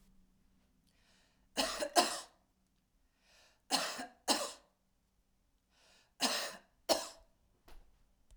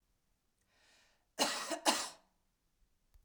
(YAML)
three_cough_length: 8.4 s
three_cough_amplitude: 10052
three_cough_signal_mean_std_ratio: 0.32
cough_length: 3.2 s
cough_amplitude: 5693
cough_signal_mean_std_ratio: 0.32
survey_phase: beta (2021-08-13 to 2022-03-07)
age: 45-64
gender: Female
wearing_mask: 'No'
symptom_none: true
smoker_status: Never smoked
respiratory_condition_asthma: false
respiratory_condition_other: false
recruitment_source: REACT
submission_delay: 34 days
covid_test_result: Negative
covid_test_method: RT-qPCR
influenza_a_test_result: Negative
influenza_b_test_result: Negative